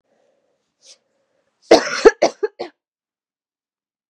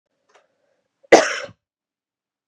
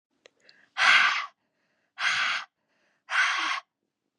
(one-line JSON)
{"three_cough_length": "4.1 s", "three_cough_amplitude": 32768, "three_cough_signal_mean_std_ratio": 0.22, "cough_length": "2.5 s", "cough_amplitude": 32768, "cough_signal_mean_std_ratio": 0.2, "exhalation_length": "4.2 s", "exhalation_amplitude": 15177, "exhalation_signal_mean_std_ratio": 0.45, "survey_phase": "beta (2021-08-13 to 2022-03-07)", "age": "18-44", "gender": "Female", "wearing_mask": "No", "symptom_cough_any": true, "symptom_new_continuous_cough": true, "symptom_runny_or_blocked_nose": true, "symptom_shortness_of_breath": true, "symptom_sore_throat": true, "symptom_abdominal_pain": true, "symptom_fever_high_temperature": true, "symptom_headache": true, "symptom_other": true, "symptom_onset": "6 days", "smoker_status": "Never smoked", "respiratory_condition_asthma": true, "respiratory_condition_other": false, "recruitment_source": "Test and Trace", "submission_delay": "2 days", "covid_test_result": "Positive", "covid_test_method": "RT-qPCR", "covid_ct_value": 18.8, "covid_ct_gene": "ORF1ab gene", "covid_ct_mean": 19.3, "covid_viral_load": "470000 copies/ml", "covid_viral_load_category": "Low viral load (10K-1M copies/ml)"}